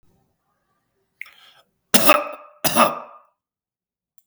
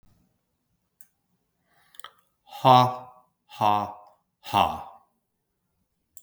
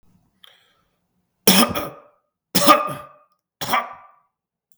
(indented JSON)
{
  "cough_length": "4.3 s",
  "cough_amplitude": 32768,
  "cough_signal_mean_std_ratio": 0.28,
  "exhalation_length": "6.2 s",
  "exhalation_amplitude": 25067,
  "exhalation_signal_mean_std_ratio": 0.26,
  "three_cough_length": "4.8 s",
  "three_cough_amplitude": 32768,
  "three_cough_signal_mean_std_ratio": 0.32,
  "survey_phase": "beta (2021-08-13 to 2022-03-07)",
  "age": "45-64",
  "gender": "Male",
  "wearing_mask": "No",
  "symptom_none": true,
  "smoker_status": "Ex-smoker",
  "respiratory_condition_asthma": false,
  "respiratory_condition_other": false,
  "recruitment_source": "REACT",
  "submission_delay": "1 day",
  "covid_test_result": "Negative",
  "covid_test_method": "RT-qPCR",
  "influenza_a_test_result": "Unknown/Void",
  "influenza_b_test_result": "Unknown/Void"
}